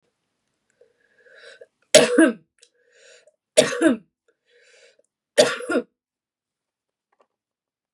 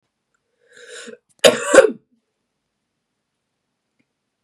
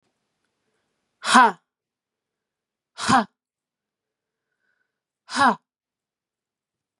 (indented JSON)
{
  "three_cough_length": "7.9 s",
  "three_cough_amplitude": 32768,
  "three_cough_signal_mean_std_ratio": 0.26,
  "cough_length": "4.4 s",
  "cough_amplitude": 32768,
  "cough_signal_mean_std_ratio": 0.21,
  "exhalation_length": "7.0 s",
  "exhalation_amplitude": 31772,
  "exhalation_signal_mean_std_ratio": 0.23,
  "survey_phase": "beta (2021-08-13 to 2022-03-07)",
  "age": "18-44",
  "gender": "Female",
  "wearing_mask": "No",
  "symptom_cough_any": true,
  "symptom_runny_or_blocked_nose": true,
  "symptom_sore_throat": true,
  "symptom_fatigue": true,
  "symptom_headache": true,
  "symptom_onset": "7 days",
  "smoker_status": "Never smoked",
  "respiratory_condition_asthma": false,
  "respiratory_condition_other": false,
  "recruitment_source": "Test and Trace",
  "submission_delay": "2 days",
  "covid_test_result": "Positive",
  "covid_test_method": "RT-qPCR",
  "covid_ct_value": 25.7,
  "covid_ct_gene": "ORF1ab gene",
  "covid_ct_mean": 25.9,
  "covid_viral_load": "3200 copies/ml",
  "covid_viral_load_category": "Minimal viral load (< 10K copies/ml)"
}